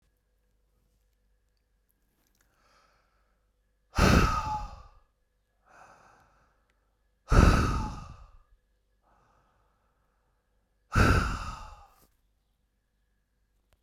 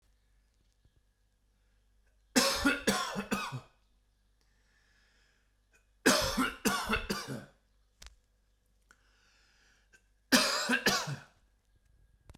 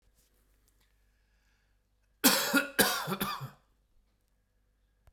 {"exhalation_length": "13.8 s", "exhalation_amplitude": 16736, "exhalation_signal_mean_std_ratio": 0.28, "three_cough_length": "12.4 s", "three_cough_amplitude": 11571, "three_cough_signal_mean_std_ratio": 0.37, "cough_length": "5.1 s", "cough_amplitude": 16544, "cough_signal_mean_std_ratio": 0.32, "survey_phase": "beta (2021-08-13 to 2022-03-07)", "age": "45-64", "gender": "Male", "wearing_mask": "No", "symptom_cough_any": true, "smoker_status": "Never smoked", "respiratory_condition_asthma": false, "respiratory_condition_other": false, "recruitment_source": "REACT", "submission_delay": "1 day", "covid_test_result": "Negative", "covid_test_method": "RT-qPCR"}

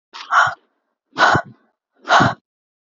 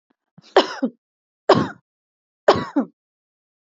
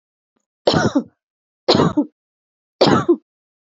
{"exhalation_length": "2.9 s", "exhalation_amplitude": 27577, "exhalation_signal_mean_std_ratio": 0.41, "cough_length": "3.7 s", "cough_amplitude": 27647, "cough_signal_mean_std_ratio": 0.29, "three_cough_length": "3.7 s", "three_cough_amplitude": 31534, "three_cough_signal_mean_std_ratio": 0.4, "survey_phase": "beta (2021-08-13 to 2022-03-07)", "age": "18-44", "gender": "Female", "wearing_mask": "No", "symptom_none": true, "smoker_status": "Never smoked", "respiratory_condition_asthma": false, "respiratory_condition_other": false, "recruitment_source": "REACT", "submission_delay": "9 days", "covid_test_result": "Negative", "covid_test_method": "RT-qPCR", "influenza_a_test_result": "Negative", "influenza_b_test_result": "Negative"}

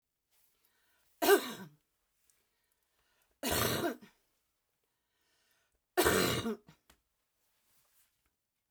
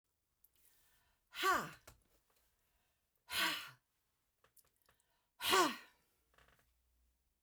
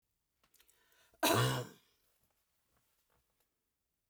{"three_cough_length": "8.7 s", "three_cough_amplitude": 6670, "three_cough_signal_mean_std_ratio": 0.3, "exhalation_length": "7.4 s", "exhalation_amplitude": 3762, "exhalation_signal_mean_std_ratio": 0.28, "cough_length": "4.1 s", "cough_amplitude": 4235, "cough_signal_mean_std_ratio": 0.26, "survey_phase": "beta (2021-08-13 to 2022-03-07)", "age": "65+", "gender": "Female", "wearing_mask": "No", "symptom_fatigue": true, "smoker_status": "Never smoked", "respiratory_condition_asthma": false, "respiratory_condition_other": false, "recruitment_source": "REACT", "submission_delay": "1 day", "covid_test_result": "Negative", "covid_test_method": "RT-qPCR"}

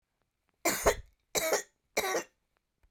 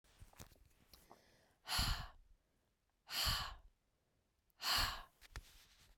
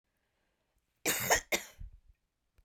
{"three_cough_length": "2.9 s", "three_cough_amplitude": 8788, "three_cough_signal_mean_std_ratio": 0.41, "exhalation_length": "6.0 s", "exhalation_amplitude": 2054, "exhalation_signal_mean_std_ratio": 0.4, "cough_length": "2.6 s", "cough_amplitude": 7703, "cough_signal_mean_std_ratio": 0.32, "survey_phase": "beta (2021-08-13 to 2022-03-07)", "age": "45-64", "gender": "Female", "wearing_mask": "No", "symptom_cough_any": true, "smoker_status": "Ex-smoker", "respiratory_condition_asthma": true, "respiratory_condition_other": false, "recruitment_source": "REACT", "submission_delay": "3 days", "covid_test_result": "Negative", "covid_test_method": "RT-qPCR"}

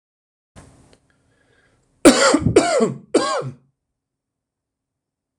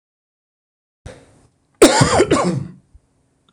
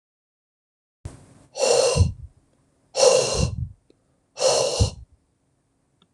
{"three_cough_length": "5.4 s", "three_cough_amplitude": 26028, "three_cough_signal_mean_std_ratio": 0.34, "cough_length": "3.5 s", "cough_amplitude": 26028, "cough_signal_mean_std_ratio": 0.36, "exhalation_length": "6.1 s", "exhalation_amplitude": 23606, "exhalation_signal_mean_std_ratio": 0.43, "survey_phase": "alpha (2021-03-01 to 2021-08-12)", "age": "45-64", "gender": "Male", "wearing_mask": "No", "symptom_none": true, "smoker_status": "Never smoked", "respiratory_condition_asthma": false, "respiratory_condition_other": false, "recruitment_source": "REACT", "submission_delay": "1 day", "covid_test_result": "Negative", "covid_test_method": "RT-qPCR"}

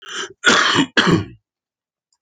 {"cough_length": "2.2 s", "cough_amplitude": 29329, "cough_signal_mean_std_ratio": 0.49, "survey_phase": "alpha (2021-03-01 to 2021-08-12)", "age": "65+", "gender": "Male", "wearing_mask": "No", "symptom_none": true, "smoker_status": "Current smoker (11 or more cigarettes per day)", "respiratory_condition_asthma": false, "respiratory_condition_other": false, "recruitment_source": "REACT", "submission_delay": "1 day", "covid_test_result": "Negative", "covid_test_method": "RT-qPCR"}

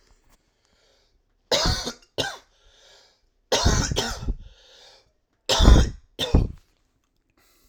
{"three_cough_length": "7.7 s", "three_cough_amplitude": 32767, "three_cough_signal_mean_std_ratio": 0.35, "survey_phase": "alpha (2021-03-01 to 2021-08-12)", "age": "18-44", "gender": "Male", "wearing_mask": "No", "symptom_cough_any": true, "symptom_new_continuous_cough": true, "symptom_fatigue": true, "symptom_onset": "2 days", "smoker_status": "Current smoker (1 to 10 cigarettes per day)", "respiratory_condition_asthma": false, "respiratory_condition_other": false, "recruitment_source": "Test and Trace", "submission_delay": "1 day", "covid_test_result": "Positive", "covid_test_method": "RT-qPCR", "covid_ct_value": 30.7, "covid_ct_gene": "N gene"}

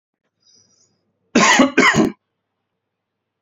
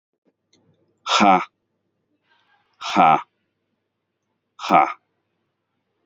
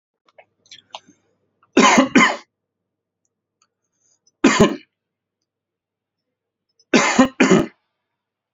{"cough_length": "3.4 s", "cough_amplitude": 29352, "cough_signal_mean_std_ratio": 0.37, "exhalation_length": "6.1 s", "exhalation_amplitude": 27912, "exhalation_signal_mean_std_ratio": 0.29, "three_cough_length": "8.5 s", "three_cough_amplitude": 31043, "three_cough_signal_mean_std_ratio": 0.31, "survey_phase": "beta (2021-08-13 to 2022-03-07)", "age": "45-64", "gender": "Male", "wearing_mask": "No", "symptom_cough_any": true, "smoker_status": "Never smoked", "respiratory_condition_asthma": false, "respiratory_condition_other": false, "recruitment_source": "REACT", "submission_delay": "1 day", "covid_test_result": "Positive", "covid_test_method": "RT-qPCR", "covid_ct_value": 23.0, "covid_ct_gene": "E gene", "influenza_a_test_result": "Negative", "influenza_b_test_result": "Negative"}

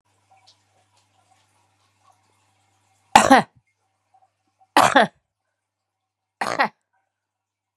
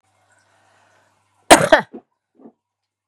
{"three_cough_length": "7.8 s", "three_cough_amplitude": 32768, "three_cough_signal_mean_std_ratio": 0.21, "cough_length": "3.1 s", "cough_amplitude": 32768, "cough_signal_mean_std_ratio": 0.21, "survey_phase": "beta (2021-08-13 to 2022-03-07)", "age": "45-64", "gender": "Female", "wearing_mask": "No", "symptom_headache": true, "smoker_status": "Ex-smoker", "respiratory_condition_asthma": false, "respiratory_condition_other": false, "recruitment_source": "REACT", "submission_delay": "2 days", "covid_test_result": "Negative", "covid_test_method": "RT-qPCR", "influenza_a_test_result": "Negative", "influenza_b_test_result": "Negative"}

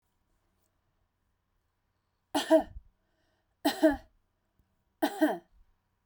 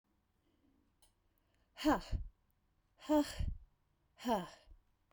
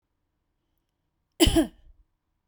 {"three_cough_length": "6.1 s", "three_cough_amplitude": 8525, "three_cough_signal_mean_std_ratio": 0.26, "exhalation_length": "5.1 s", "exhalation_amplitude": 3213, "exhalation_signal_mean_std_ratio": 0.34, "cough_length": "2.5 s", "cough_amplitude": 17746, "cough_signal_mean_std_ratio": 0.25, "survey_phase": "beta (2021-08-13 to 2022-03-07)", "age": "45-64", "gender": "Female", "wearing_mask": "No", "symptom_none": true, "smoker_status": "Never smoked", "respiratory_condition_asthma": false, "respiratory_condition_other": false, "recruitment_source": "REACT", "submission_delay": "1 day", "covid_test_result": "Negative", "covid_test_method": "RT-qPCR"}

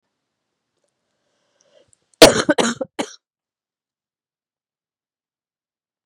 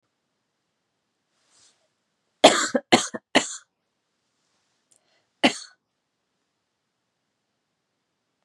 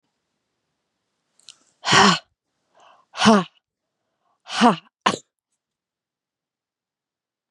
{"cough_length": "6.1 s", "cough_amplitude": 32768, "cough_signal_mean_std_ratio": 0.17, "three_cough_length": "8.4 s", "three_cough_amplitude": 32767, "three_cough_signal_mean_std_ratio": 0.18, "exhalation_length": "7.5 s", "exhalation_amplitude": 32443, "exhalation_signal_mean_std_ratio": 0.26, "survey_phase": "beta (2021-08-13 to 2022-03-07)", "age": "18-44", "gender": "Female", "wearing_mask": "No", "symptom_cough_any": true, "symptom_shortness_of_breath": true, "symptom_abdominal_pain": true, "symptom_fatigue": true, "symptom_other": true, "smoker_status": "Ex-smoker", "respiratory_condition_asthma": false, "respiratory_condition_other": false, "recruitment_source": "REACT", "submission_delay": "1 day", "covid_test_result": "Negative", "covid_test_method": "RT-qPCR", "influenza_a_test_result": "Unknown/Void", "influenza_b_test_result": "Unknown/Void"}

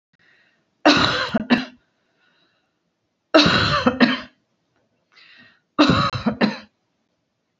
{"three_cough_length": "7.6 s", "three_cough_amplitude": 28084, "three_cough_signal_mean_std_ratio": 0.41, "survey_phase": "beta (2021-08-13 to 2022-03-07)", "age": "45-64", "gender": "Female", "wearing_mask": "No", "symptom_none": true, "smoker_status": "Never smoked", "respiratory_condition_asthma": false, "respiratory_condition_other": false, "recruitment_source": "REACT", "submission_delay": "2 days", "covid_test_result": "Negative", "covid_test_method": "RT-qPCR"}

